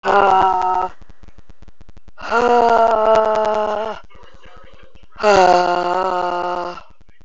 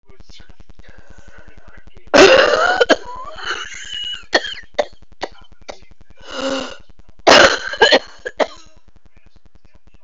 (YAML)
exhalation_length: 7.2 s
exhalation_amplitude: 29441
exhalation_signal_mean_std_ratio: 0.67
cough_length: 10.0 s
cough_amplitude: 32768
cough_signal_mean_std_ratio: 0.45
survey_phase: beta (2021-08-13 to 2022-03-07)
age: 45-64
gender: Female
wearing_mask: 'No'
symptom_cough_any: true
symptom_new_continuous_cough: true
symptom_runny_or_blocked_nose: true
symptom_shortness_of_breath: true
symptom_sore_throat: true
symptom_abdominal_pain: true
symptom_fatigue: true
symptom_headache: true
symptom_change_to_sense_of_smell_or_taste: true
symptom_onset: 4 days
smoker_status: Never smoked
respiratory_condition_asthma: false
respiratory_condition_other: false
recruitment_source: Test and Trace
submission_delay: 2 days
covid_test_result: Positive
covid_test_method: RT-qPCR